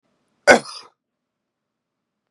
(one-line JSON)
{"cough_length": "2.3 s", "cough_amplitude": 32768, "cough_signal_mean_std_ratio": 0.18, "survey_phase": "beta (2021-08-13 to 2022-03-07)", "age": "18-44", "gender": "Male", "wearing_mask": "No", "symptom_sore_throat": true, "symptom_fatigue": true, "smoker_status": "Never smoked", "respiratory_condition_asthma": false, "respiratory_condition_other": false, "recruitment_source": "Test and Trace", "submission_delay": "0 days", "covid_test_result": "Positive", "covid_test_method": "RT-qPCR", "covid_ct_value": 16.9, "covid_ct_gene": "N gene"}